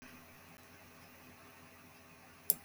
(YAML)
cough_length: 2.6 s
cough_amplitude: 12504
cough_signal_mean_std_ratio: 0.25
survey_phase: beta (2021-08-13 to 2022-03-07)
age: 65+
gender: Female
wearing_mask: 'No'
symptom_none: true
symptom_onset: 13 days
smoker_status: Never smoked
respiratory_condition_asthma: false
respiratory_condition_other: false
recruitment_source: REACT
submission_delay: 2 days
covid_test_result: Negative
covid_test_method: RT-qPCR
influenza_a_test_result: Negative
influenza_b_test_result: Negative